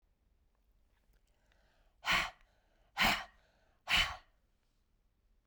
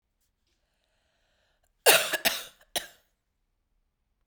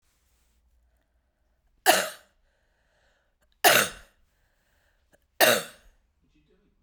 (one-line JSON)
{"exhalation_length": "5.5 s", "exhalation_amplitude": 4702, "exhalation_signal_mean_std_ratio": 0.29, "cough_length": "4.3 s", "cough_amplitude": 24923, "cough_signal_mean_std_ratio": 0.23, "three_cough_length": "6.8 s", "three_cough_amplitude": 23470, "three_cough_signal_mean_std_ratio": 0.24, "survey_phase": "beta (2021-08-13 to 2022-03-07)", "age": "45-64", "gender": "Female", "wearing_mask": "No", "symptom_cough_any": true, "symptom_runny_or_blocked_nose": true, "symptom_sore_throat": true, "symptom_change_to_sense_of_smell_or_taste": true, "symptom_loss_of_taste": true, "symptom_onset": "5 days", "smoker_status": "Ex-smoker", "respiratory_condition_asthma": false, "respiratory_condition_other": false, "recruitment_source": "Test and Trace", "submission_delay": "2 days", "covid_test_result": "Positive", "covid_test_method": "RT-qPCR", "covid_ct_value": 23.4, "covid_ct_gene": "ORF1ab gene"}